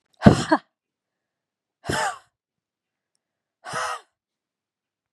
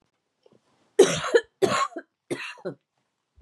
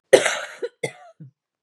{"exhalation_length": "5.1 s", "exhalation_amplitude": 32768, "exhalation_signal_mean_std_ratio": 0.22, "three_cough_length": "3.4 s", "three_cough_amplitude": 21677, "three_cough_signal_mean_std_ratio": 0.33, "cough_length": "1.6 s", "cough_amplitude": 32768, "cough_signal_mean_std_ratio": 0.3, "survey_phase": "beta (2021-08-13 to 2022-03-07)", "age": "18-44", "gender": "Female", "wearing_mask": "No", "symptom_cough_any": true, "symptom_runny_or_blocked_nose": true, "symptom_sore_throat": true, "symptom_fatigue": true, "symptom_onset": "6 days", "smoker_status": "Ex-smoker", "respiratory_condition_asthma": false, "respiratory_condition_other": false, "recruitment_source": "REACT", "submission_delay": "1 day", "covid_test_result": "Negative", "covid_test_method": "RT-qPCR", "influenza_a_test_result": "Negative", "influenza_b_test_result": "Negative"}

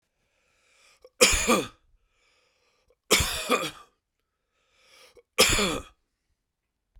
{"three_cough_length": "7.0 s", "three_cough_amplitude": 24386, "three_cough_signal_mean_std_ratio": 0.33, "survey_phase": "beta (2021-08-13 to 2022-03-07)", "age": "45-64", "gender": "Male", "wearing_mask": "No", "symptom_cough_any": true, "symptom_runny_or_blocked_nose": true, "symptom_headache": true, "smoker_status": "Ex-smoker", "respiratory_condition_asthma": false, "respiratory_condition_other": false, "recruitment_source": "Test and Trace", "submission_delay": "1 day", "covid_test_result": "Positive", "covid_test_method": "LFT"}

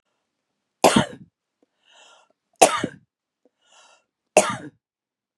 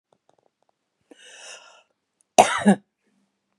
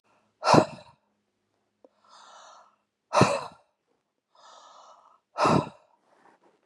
{"three_cough_length": "5.4 s", "three_cough_amplitude": 32768, "three_cough_signal_mean_std_ratio": 0.23, "cough_length": "3.6 s", "cough_amplitude": 32767, "cough_signal_mean_std_ratio": 0.21, "exhalation_length": "6.7 s", "exhalation_amplitude": 27231, "exhalation_signal_mean_std_ratio": 0.27, "survey_phase": "beta (2021-08-13 to 2022-03-07)", "age": "45-64", "gender": "Female", "wearing_mask": "No", "symptom_none": true, "smoker_status": "Never smoked", "respiratory_condition_asthma": false, "respiratory_condition_other": false, "recruitment_source": "REACT", "submission_delay": "2 days", "covid_test_result": "Negative", "covid_test_method": "RT-qPCR", "influenza_a_test_result": "Unknown/Void", "influenza_b_test_result": "Unknown/Void"}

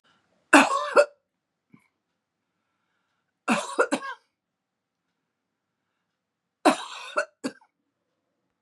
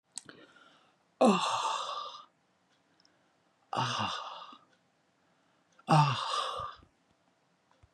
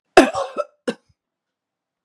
{"three_cough_length": "8.6 s", "three_cough_amplitude": 27780, "three_cough_signal_mean_std_ratio": 0.25, "exhalation_length": "7.9 s", "exhalation_amplitude": 9134, "exhalation_signal_mean_std_ratio": 0.39, "cough_length": "2.0 s", "cough_amplitude": 32768, "cough_signal_mean_std_ratio": 0.25, "survey_phase": "beta (2021-08-13 to 2022-03-07)", "age": "65+", "gender": "Female", "wearing_mask": "No", "symptom_none": true, "smoker_status": "Ex-smoker", "respiratory_condition_asthma": false, "respiratory_condition_other": false, "recruitment_source": "REACT", "submission_delay": "1 day", "covid_test_result": "Negative", "covid_test_method": "RT-qPCR", "influenza_a_test_result": "Negative", "influenza_b_test_result": "Negative"}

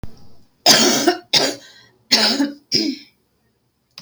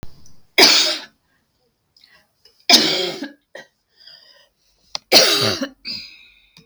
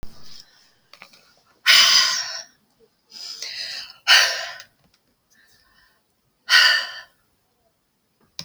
{"cough_length": "4.0 s", "cough_amplitude": 32768, "cough_signal_mean_std_ratio": 0.49, "three_cough_length": "6.7 s", "three_cough_amplitude": 32767, "three_cough_signal_mean_std_ratio": 0.37, "exhalation_length": "8.4 s", "exhalation_amplitude": 32566, "exhalation_signal_mean_std_ratio": 0.35, "survey_phase": "beta (2021-08-13 to 2022-03-07)", "age": "65+", "gender": "Female", "wearing_mask": "No", "symptom_none": true, "smoker_status": "Current smoker (1 to 10 cigarettes per day)", "respiratory_condition_asthma": false, "respiratory_condition_other": false, "recruitment_source": "REACT", "submission_delay": "2 days", "covid_test_result": "Negative", "covid_test_method": "RT-qPCR"}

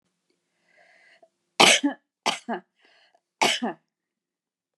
{"three_cough_length": "4.8 s", "three_cough_amplitude": 32741, "three_cough_signal_mean_std_ratio": 0.27, "survey_phase": "beta (2021-08-13 to 2022-03-07)", "age": "65+", "gender": "Female", "wearing_mask": "Yes", "symptom_none": true, "smoker_status": "Never smoked", "respiratory_condition_asthma": false, "respiratory_condition_other": false, "recruitment_source": "REACT", "submission_delay": "3 days", "covid_test_result": "Negative", "covid_test_method": "RT-qPCR"}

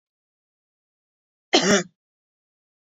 {"cough_length": "2.8 s", "cough_amplitude": 26270, "cough_signal_mean_std_ratio": 0.24, "survey_phase": "beta (2021-08-13 to 2022-03-07)", "age": "45-64", "gender": "Female", "wearing_mask": "No", "symptom_none": true, "smoker_status": "Never smoked", "respiratory_condition_asthma": false, "respiratory_condition_other": false, "recruitment_source": "REACT", "submission_delay": "1 day", "covid_test_result": "Negative", "covid_test_method": "RT-qPCR"}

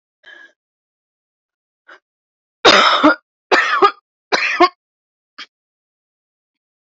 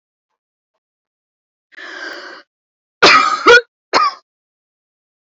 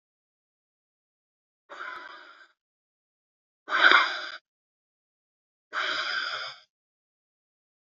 {"three_cough_length": "6.9 s", "three_cough_amplitude": 32768, "three_cough_signal_mean_std_ratio": 0.32, "cough_length": "5.4 s", "cough_amplitude": 32432, "cough_signal_mean_std_ratio": 0.31, "exhalation_length": "7.9 s", "exhalation_amplitude": 26702, "exhalation_signal_mean_std_ratio": 0.28, "survey_phase": "beta (2021-08-13 to 2022-03-07)", "age": "18-44", "gender": "Female", "wearing_mask": "No", "symptom_runny_or_blocked_nose": true, "symptom_sore_throat": true, "symptom_fatigue": true, "symptom_onset": "13 days", "smoker_status": "Never smoked", "respiratory_condition_asthma": true, "respiratory_condition_other": false, "recruitment_source": "REACT", "submission_delay": "1 day", "covid_test_result": "Negative", "covid_test_method": "RT-qPCR", "influenza_a_test_result": "Negative", "influenza_b_test_result": "Negative"}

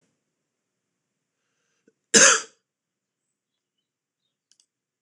{"cough_length": "5.0 s", "cough_amplitude": 26028, "cough_signal_mean_std_ratio": 0.17, "survey_phase": "beta (2021-08-13 to 2022-03-07)", "age": "45-64", "gender": "Male", "wearing_mask": "No", "symptom_cough_any": true, "symptom_runny_or_blocked_nose": true, "smoker_status": "Never smoked", "respiratory_condition_asthma": false, "respiratory_condition_other": false, "recruitment_source": "Test and Trace", "submission_delay": "2 days", "covid_test_result": "Positive", "covid_test_method": "RT-qPCR", "covid_ct_value": 27.6, "covid_ct_gene": "ORF1ab gene"}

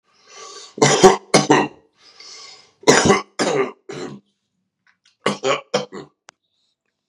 {"three_cough_length": "7.1 s", "three_cough_amplitude": 32768, "three_cough_signal_mean_std_ratio": 0.37, "survey_phase": "beta (2021-08-13 to 2022-03-07)", "age": "45-64", "gender": "Male", "wearing_mask": "No", "symptom_cough_any": true, "symptom_runny_or_blocked_nose": true, "symptom_shortness_of_breath": true, "symptom_sore_throat": true, "symptom_abdominal_pain": true, "symptom_fatigue": true, "symptom_fever_high_temperature": true, "symptom_headache": true, "symptom_change_to_sense_of_smell_or_taste": true, "symptom_loss_of_taste": true, "symptom_other": true, "symptom_onset": "4 days", "smoker_status": "Ex-smoker", "respiratory_condition_asthma": false, "respiratory_condition_other": false, "recruitment_source": "Test and Trace", "submission_delay": "1 day", "covid_test_result": "Positive", "covid_test_method": "RT-qPCR", "covid_ct_value": 17.4, "covid_ct_gene": "ORF1ab gene", "covid_ct_mean": 17.7, "covid_viral_load": "1500000 copies/ml", "covid_viral_load_category": "High viral load (>1M copies/ml)"}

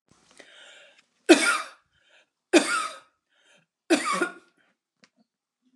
{"three_cough_length": "5.8 s", "three_cough_amplitude": 27899, "three_cough_signal_mean_std_ratio": 0.29, "survey_phase": "alpha (2021-03-01 to 2021-08-12)", "age": "65+", "gender": "Female", "wearing_mask": "No", "symptom_none": true, "smoker_status": "Never smoked", "respiratory_condition_asthma": false, "respiratory_condition_other": false, "recruitment_source": "REACT", "submission_delay": "2 days", "covid_test_result": "Negative", "covid_test_method": "RT-qPCR"}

